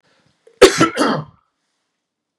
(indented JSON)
{
  "cough_length": "2.4 s",
  "cough_amplitude": 32768,
  "cough_signal_mean_std_ratio": 0.32,
  "survey_phase": "beta (2021-08-13 to 2022-03-07)",
  "age": "45-64",
  "gender": "Male",
  "wearing_mask": "No",
  "symptom_none": true,
  "smoker_status": "Never smoked",
  "respiratory_condition_asthma": false,
  "respiratory_condition_other": false,
  "recruitment_source": "REACT",
  "submission_delay": "3 days",
  "covid_test_result": "Negative",
  "covid_test_method": "RT-qPCR",
  "influenza_a_test_result": "Negative",
  "influenza_b_test_result": "Negative"
}